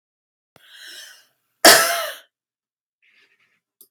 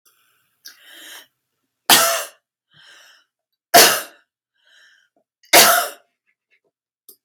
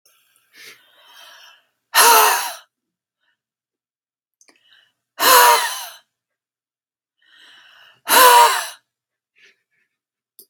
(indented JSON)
{
  "cough_length": "3.9 s",
  "cough_amplitude": 32768,
  "cough_signal_mean_std_ratio": 0.24,
  "three_cough_length": "7.2 s",
  "three_cough_amplitude": 32768,
  "three_cough_signal_mean_std_ratio": 0.28,
  "exhalation_length": "10.5 s",
  "exhalation_amplitude": 32768,
  "exhalation_signal_mean_std_ratio": 0.32,
  "survey_phase": "beta (2021-08-13 to 2022-03-07)",
  "age": "65+",
  "gender": "Female",
  "wearing_mask": "No",
  "symptom_none": true,
  "smoker_status": "Never smoked",
  "respiratory_condition_asthma": false,
  "respiratory_condition_other": false,
  "recruitment_source": "REACT",
  "submission_delay": "2 days",
  "covid_test_result": "Negative",
  "covid_test_method": "RT-qPCR"
}